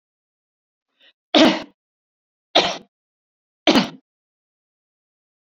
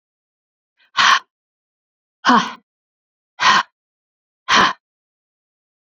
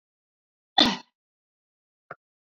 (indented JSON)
{
  "three_cough_length": "5.5 s",
  "three_cough_amplitude": 30318,
  "three_cough_signal_mean_std_ratio": 0.25,
  "exhalation_length": "5.8 s",
  "exhalation_amplitude": 30079,
  "exhalation_signal_mean_std_ratio": 0.31,
  "cough_length": "2.5 s",
  "cough_amplitude": 19611,
  "cough_signal_mean_std_ratio": 0.19,
  "survey_phase": "beta (2021-08-13 to 2022-03-07)",
  "age": "45-64",
  "gender": "Female",
  "wearing_mask": "No",
  "symptom_cough_any": true,
  "symptom_new_continuous_cough": true,
  "symptom_runny_or_blocked_nose": true,
  "symptom_fatigue": true,
  "symptom_onset": "4 days",
  "smoker_status": "Never smoked",
  "respiratory_condition_asthma": false,
  "respiratory_condition_other": false,
  "recruitment_source": "Test and Trace",
  "submission_delay": "1 day",
  "covid_test_result": "Positive",
  "covid_test_method": "RT-qPCR",
  "covid_ct_value": 25.1,
  "covid_ct_gene": "ORF1ab gene"
}